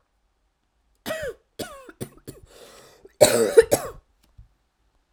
cough_length: 5.1 s
cough_amplitude: 32768
cough_signal_mean_std_ratio: 0.26
survey_phase: alpha (2021-03-01 to 2021-08-12)
age: 18-44
gender: Female
wearing_mask: 'No'
symptom_cough_any: true
symptom_diarrhoea: true
symptom_headache: true
symptom_change_to_sense_of_smell_or_taste: true
smoker_status: Never smoked
respiratory_condition_asthma: false
respiratory_condition_other: false
recruitment_source: Test and Trace
submission_delay: 2 days
covid_test_result: Positive
covid_test_method: RT-qPCR
covid_ct_value: 19.4
covid_ct_gene: ORF1ab gene
covid_ct_mean: 20.4
covid_viral_load: 200000 copies/ml
covid_viral_load_category: Low viral load (10K-1M copies/ml)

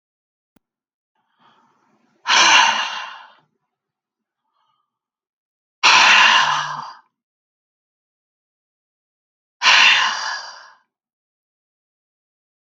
exhalation_length: 12.8 s
exhalation_amplitude: 31741
exhalation_signal_mean_std_ratio: 0.33
survey_phase: beta (2021-08-13 to 2022-03-07)
age: 45-64
gender: Female
wearing_mask: 'No'
symptom_cough_any: true
symptom_runny_or_blocked_nose: true
symptom_fatigue: true
symptom_change_to_sense_of_smell_or_taste: true
symptom_loss_of_taste: true
symptom_onset: 5 days
smoker_status: Never smoked
respiratory_condition_asthma: false
respiratory_condition_other: false
recruitment_source: Test and Trace
submission_delay: 2 days
covid_test_result: Positive
covid_test_method: RT-qPCR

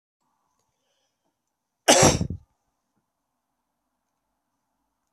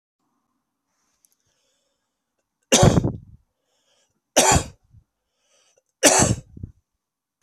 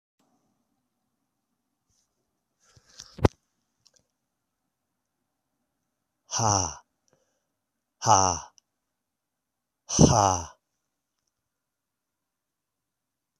cough_length: 5.1 s
cough_amplitude: 25463
cough_signal_mean_std_ratio: 0.2
three_cough_length: 7.4 s
three_cough_amplitude: 32768
three_cough_signal_mean_std_ratio: 0.28
exhalation_length: 13.4 s
exhalation_amplitude: 23447
exhalation_signal_mean_std_ratio: 0.21
survey_phase: beta (2021-08-13 to 2022-03-07)
age: 45-64
gender: Male
wearing_mask: 'No'
symptom_cough_any: true
symptom_fatigue: true
symptom_fever_high_temperature: true
symptom_headache: true
smoker_status: Ex-smoker
respiratory_condition_asthma: true
respiratory_condition_other: false
recruitment_source: Test and Trace
submission_delay: 3 days
covid_test_result: Positive
covid_test_method: LFT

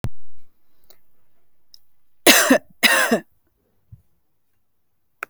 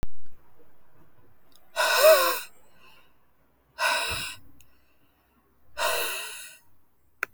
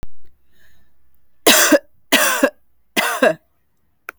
cough_length: 5.3 s
cough_amplitude: 32768
cough_signal_mean_std_ratio: 0.39
exhalation_length: 7.3 s
exhalation_amplitude: 17514
exhalation_signal_mean_std_ratio: 0.46
three_cough_length: 4.2 s
three_cough_amplitude: 32768
three_cough_signal_mean_std_ratio: 0.46
survey_phase: alpha (2021-03-01 to 2021-08-12)
age: 18-44
gender: Female
wearing_mask: 'No'
symptom_none: true
smoker_status: Never smoked
respiratory_condition_asthma: false
respiratory_condition_other: false
recruitment_source: REACT
submission_delay: 1 day
covid_test_result: Negative
covid_test_method: RT-qPCR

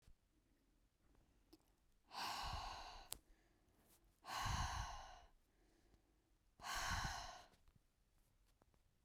exhalation_length: 9.0 s
exhalation_amplitude: 3135
exhalation_signal_mean_std_ratio: 0.47
survey_phase: beta (2021-08-13 to 2022-03-07)
age: 18-44
gender: Female
wearing_mask: 'No'
symptom_shortness_of_breath: true
symptom_sore_throat: true
symptom_fatigue: true
symptom_other: true
symptom_onset: 4 days
smoker_status: Never smoked
respiratory_condition_asthma: false
respiratory_condition_other: false
recruitment_source: Test and Trace
submission_delay: 2 days
covid_test_result: Positive
covid_test_method: RT-qPCR
covid_ct_value: 27.6
covid_ct_gene: ORF1ab gene
covid_ct_mean: 28.0
covid_viral_load: 640 copies/ml
covid_viral_load_category: Minimal viral load (< 10K copies/ml)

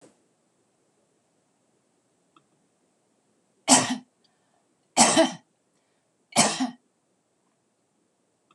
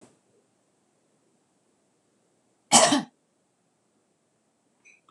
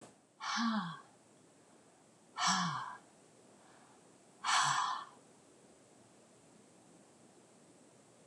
three_cough_length: 8.5 s
three_cough_amplitude: 23847
three_cough_signal_mean_std_ratio: 0.24
cough_length: 5.1 s
cough_amplitude: 24203
cough_signal_mean_std_ratio: 0.19
exhalation_length: 8.3 s
exhalation_amplitude: 4057
exhalation_signal_mean_std_ratio: 0.41
survey_phase: beta (2021-08-13 to 2022-03-07)
age: 65+
gender: Female
wearing_mask: 'No'
symptom_none: true
smoker_status: Ex-smoker
respiratory_condition_asthma: false
respiratory_condition_other: false
recruitment_source: REACT
submission_delay: 1 day
covid_test_result: Negative
covid_test_method: RT-qPCR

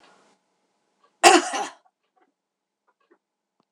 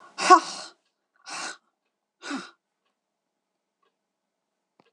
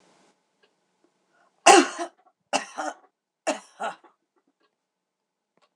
cough_length: 3.7 s
cough_amplitude: 26028
cough_signal_mean_std_ratio: 0.21
exhalation_length: 4.9 s
exhalation_amplitude: 25770
exhalation_signal_mean_std_ratio: 0.19
three_cough_length: 5.8 s
three_cough_amplitude: 26028
three_cough_signal_mean_std_ratio: 0.21
survey_phase: beta (2021-08-13 to 2022-03-07)
age: 65+
gender: Female
wearing_mask: 'No'
symptom_none: true
smoker_status: Never smoked
respiratory_condition_asthma: false
respiratory_condition_other: false
recruitment_source: REACT
submission_delay: 1 day
covid_test_result: Negative
covid_test_method: RT-qPCR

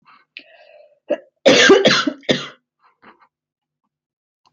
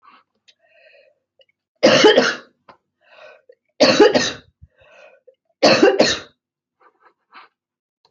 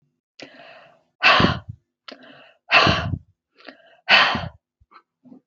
cough_length: 4.5 s
cough_amplitude: 30143
cough_signal_mean_std_ratio: 0.34
three_cough_length: 8.1 s
three_cough_amplitude: 29084
three_cough_signal_mean_std_ratio: 0.34
exhalation_length: 5.5 s
exhalation_amplitude: 28500
exhalation_signal_mean_std_ratio: 0.36
survey_phase: beta (2021-08-13 to 2022-03-07)
age: 45-64
gender: Female
wearing_mask: 'No'
symptom_cough_any: true
symptom_runny_or_blocked_nose: true
symptom_headache: true
symptom_onset: 8 days
smoker_status: Never smoked
respiratory_condition_asthma: false
respiratory_condition_other: false
recruitment_source: REACT
submission_delay: 1 day
covid_test_result: Negative
covid_test_method: RT-qPCR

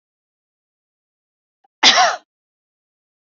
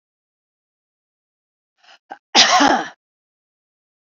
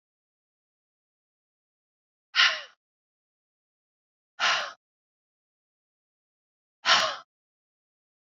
three_cough_length: 3.2 s
three_cough_amplitude: 30094
three_cough_signal_mean_std_ratio: 0.24
cough_length: 4.0 s
cough_amplitude: 31653
cough_signal_mean_std_ratio: 0.28
exhalation_length: 8.4 s
exhalation_amplitude: 17577
exhalation_signal_mean_std_ratio: 0.23
survey_phase: beta (2021-08-13 to 2022-03-07)
age: 45-64
gender: Female
wearing_mask: 'No'
symptom_none: true
smoker_status: Never smoked
respiratory_condition_asthma: false
respiratory_condition_other: false
recruitment_source: REACT
submission_delay: 1 day
covid_test_result: Negative
covid_test_method: RT-qPCR
influenza_a_test_result: Negative
influenza_b_test_result: Negative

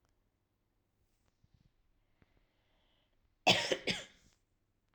cough_length: 4.9 s
cough_amplitude: 8080
cough_signal_mean_std_ratio: 0.21
survey_phase: alpha (2021-03-01 to 2021-08-12)
age: 18-44
gender: Female
wearing_mask: 'No'
symptom_none: true
smoker_status: Never smoked
respiratory_condition_asthma: false
respiratory_condition_other: false
recruitment_source: REACT
submission_delay: 1 day
covid_test_result: Negative
covid_test_method: RT-qPCR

